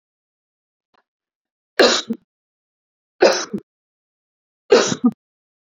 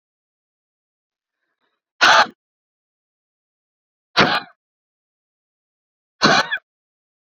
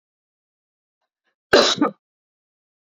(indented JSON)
{
  "three_cough_length": "5.7 s",
  "three_cough_amplitude": 28553,
  "three_cough_signal_mean_std_ratio": 0.28,
  "exhalation_length": "7.3 s",
  "exhalation_amplitude": 30401,
  "exhalation_signal_mean_std_ratio": 0.25,
  "cough_length": "3.0 s",
  "cough_amplitude": 28546,
  "cough_signal_mean_std_ratio": 0.25,
  "survey_phase": "beta (2021-08-13 to 2022-03-07)",
  "age": "18-44",
  "gender": "Female",
  "wearing_mask": "No",
  "symptom_fatigue": true,
  "symptom_onset": "2 days",
  "smoker_status": "Current smoker (1 to 10 cigarettes per day)",
  "respiratory_condition_asthma": true,
  "respiratory_condition_other": false,
  "recruitment_source": "REACT",
  "submission_delay": "2 days",
  "covid_test_result": "Negative",
  "covid_test_method": "RT-qPCR",
  "influenza_a_test_result": "Negative",
  "influenza_b_test_result": "Negative"
}